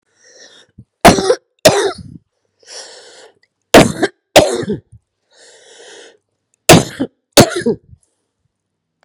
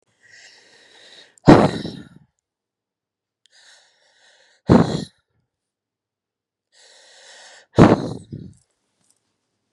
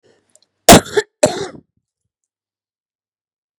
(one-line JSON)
{"three_cough_length": "9.0 s", "three_cough_amplitude": 32768, "three_cough_signal_mean_std_ratio": 0.32, "exhalation_length": "9.7 s", "exhalation_amplitude": 32768, "exhalation_signal_mean_std_ratio": 0.22, "cough_length": "3.6 s", "cough_amplitude": 32768, "cough_signal_mean_std_ratio": 0.22, "survey_phase": "beta (2021-08-13 to 2022-03-07)", "age": "65+", "gender": "Female", "wearing_mask": "No", "symptom_cough_any": true, "symptom_sore_throat": true, "symptom_diarrhoea": true, "symptom_fever_high_temperature": true, "symptom_headache": true, "symptom_onset": "4 days", "smoker_status": "Ex-smoker", "respiratory_condition_asthma": false, "respiratory_condition_other": false, "recruitment_source": "REACT", "submission_delay": "3 days", "covid_test_result": "Positive", "covid_test_method": "RT-qPCR", "covid_ct_value": 26.0, "covid_ct_gene": "E gene", "influenza_a_test_result": "Negative", "influenza_b_test_result": "Negative"}